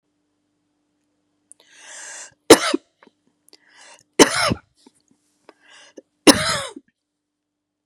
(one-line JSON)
{"three_cough_length": "7.9 s", "three_cough_amplitude": 32768, "three_cough_signal_mean_std_ratio": 0.22, "survey_phase": "beta (2021-08-13 to 2022-03-07)", "age": "45-64", "gender": "Female", "wearing_mask": "No", "symptom_shortness_of_breath": true, "symptom_fatigue": true, "symptom_headache": true, "symptom_onset": "12 days", "smoker_status": "Ex-smoker", "respiratory_condition_asthma": false, "respiratory_condition_other": true, "recruitment_source": "REACT", "submission_delay": "1 day", "covid_test_result": "Negative", "covid_test_method": "RT-qPCR", "influenza_a_test_result": "Negative", "influenza_b_test_result": "Negative"}